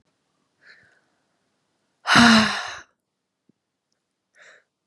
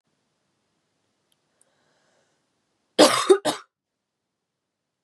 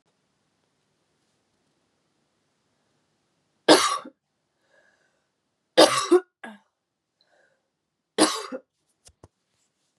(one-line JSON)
{"exhalation_length": "4.9 s", "exhalation_amplitude": 29525, "exhalation_signal_mean_std_ratio": 0.26, "cough_length": "5.0 s", "cough_amplitude": 32101, "cough_signal_mean_std_ratio": 0.21, "three_cough_length": "10.0 s", "three_cough_amplitude": 28947, "three_cough_signal_mean_std_ratio": 0.21, "survey_phase": "beta (2021-08-13 to 2022-03-07)", "age": "18-44", "gender": "Female", "wearing_mask": "No", "symptom_cough_any": true, "symptom_runny_or_blocked_nose": true, "symptom_shortness_of_breath": true, "symptom_sore_throat": true, "symptom_onset": "3 days", "smoker_status": "Never smoked", "respiratory_condition_asthma": true, "respiratory_condition_other": false, "recruitment_source": "Test and Trace", "submission_delay": "2 days", "covid_test_result": "Positive", "covid_test_method": "RT-qPCR", "covid_ct_value": 20.5, "covid_ct_gene": "N gene"}